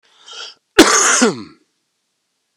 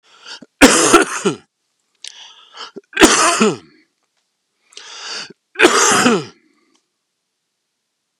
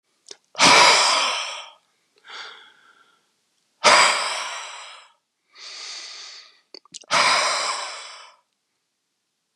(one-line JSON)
{"cough_length": "2.6 s", "cough_amplitude": 32768, "cough_signal_mean_std_ratio": 0.38, "three_cough_length": "8.2 s", "three_cough_amplitude": 32768, "three_cough_signal_mean_std_ratio": 0.39, "exhalation_length": "9.6 s", "exhalation_amplitude": 30129, "exhalation_signal_mean_std_ratio": 0.41, "survey_phase": "beta (2021-08-13 to 2022-03-07)", "age": "45-64", "gender": "Male", "wearing_mask": "No", "symptom_cough_any": true, "smoker_status": "Never smoked", "respiratory_condition_asthma": false, "respiratory_condition_other": false, "recruitment_source": "REACT", "submission_delay": "2 days", "covid_test_result": "Negative", "covid_test_method": "RT-qPCR", "influenza_a_test_result": "Unknown/Void", "influenza_b_test_result": "Unknown/Void"}